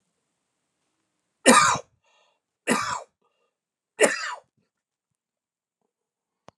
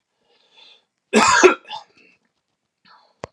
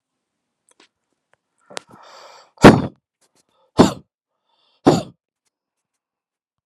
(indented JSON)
{
  "three_cough_length": "6.6 s",
  "three_cough_amplitude": 31213,
  "three_cough_signal_mean_std_ratio": 0.26,
  "cough_length": "3.3 s",
  "cough_amplitude": 32768,
  "cough_signal_mean_std_ratio": 0.29,
  "exhalation_length": "6.7 s",
  "exhalation_amplitude": 32768,
  "exhalation_signal_mean_std_ratio": 0.19,
  "survey_phase": "alpha (2021-03-01 to 2021-08-12)",
  "age": "45-64",
  "gender": "Male",
  "wearing_mask": "No",
  "symptom_none": true,
  "smoker_status": "Ex-smoker",
  "respiratory_condition_asthma": false,
  "respiratory_condition_other": false,
  "recruitment_source": "REACT",
  "submission_delay": "1 day",
  "covid_test_result": "Negative",
  "covid_test_method": "RT-qPCR"
}